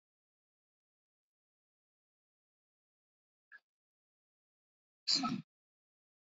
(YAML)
exhalation_length: 6.3 s
exhalation_amplitude: 4565
exhalation_signal_mean_std_ratio: 0.17
survey_phase: beta (2021-08-13 to 2022-03-07)
age: 18-44
gender: Male
wearing_mask: 'No'
symptom_cough_any: true
symptom_runny_or_blocked_nose: true
symptom_sore_throat: true
symptom_fatigue: true
symptom_onset: 2 days
smoker_status: Current smoker (e-cigarettes or vapes only)
respiratory_condition_asthma: false
respiratory_condition_other: false
recruitment_source: Test and Trace
submission_delay: 1 day
covid_test_result: Positive
covid_test_method: RT-qPCR